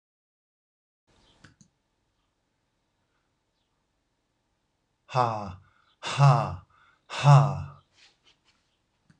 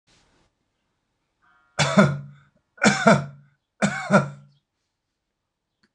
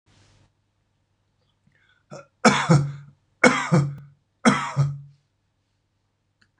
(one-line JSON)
{"exhalation_length": "9.2 s", "exhalation_amplitude": 16340, "exhalation_signal_mean_std_ratio": 0.26, "cough_length": "5.9 s", "cough_amplitude": 24756, "cough_signal_mean_std_ratio": 0.33, "three_cough_length": "6.6 s", "three_cough_amplitude": 26004, "three_cough_signal_mean_std_ratio": 0.34, "survey_phase": "alpha (2021-03-01 to 2021-08-12)", "age": "65+", "gender": "Male", "wearing_mask": "No", "symptom_none": true, "smoker_status": "Never smoked", "respiratory_condition_asthma": false, "respiratory_condition_other": false, "recruitment_source": "REACT", "submission_delay": "2 days", "covid_test_result": "Negative", "covid_test_method": "RT-qPCR"}